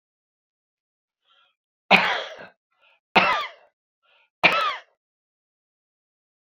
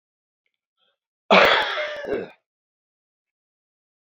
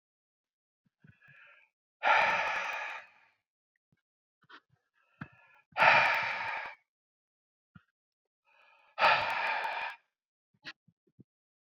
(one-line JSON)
{"three_cough_length": "6.5 s", "three_cough_amplitude": 28021, "three_cough_signal_mean_std_ratio": 0.28, "cough_length": "4.1 s", "cough_amplitude": 27163, "cough_signal_mean_std_ratio": 0.31, "exhalation_length": "11.8 s", "exhalation_amplitude": 10999, "exhalation_signal_mean_std_ratio": 0.35, "survey_phase": "beta (2021-08-13 to 2022-03-07)", "age": "65+", "gender": "Male", "wearing_mask": "No", "symptom_none": true, "smoker_status": "Ex-smoker", "respiratory_condition_asthma": false, "respiratory_condition_other": false, "recruitment_source": "REACT", "submission_delay": "1 day", "covid_test_result": "Negative", "covid_test_method": "RT-qPCR"}